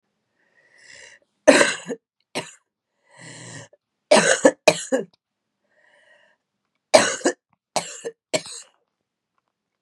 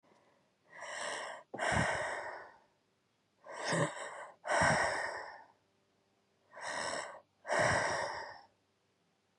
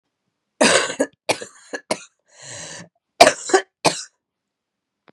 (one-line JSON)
{"three_cough_length": "9.8 s", "three_cough_amplitude": 32768, "three_cough_signal_mean_std_ratio": 0.27, "exhalation_length": "9.4 s", "exhalation_amplitude": 4191, "exhalation_signal_mean_std_ratio": 0.53, "cough_length": "5.1 s", "cough_amplitude": 32768, "cough_signal_mean_std_ratio": 0.3, "survey_phase": "beta (2021-08-13 to 2022-03-07)", "age": "45-64", "gender": "Female", "wearing_mask": "No", "symptom_cough_any": true, "symptom_shortness_of_breath": true, "symptom_fatigue": true, "symptom_headache": true, "symptom_change_to_sense_of_smell_or_taste": true, "symptom_loss_of_taste": true, "symptom_onset": "5 days", "smoker_status": "Never smoked", "respiratory_condition_asthma": false, "respiratory_condition_other": false, "recruitment_source": "Test and Trace", "submission_delay": "1 day", "covid_test_result": "Positive", "covid_test_method": "RT-qPCR", "covid_ct_value": 11.5, "covid_ct_gene": "ORF1ab gene"}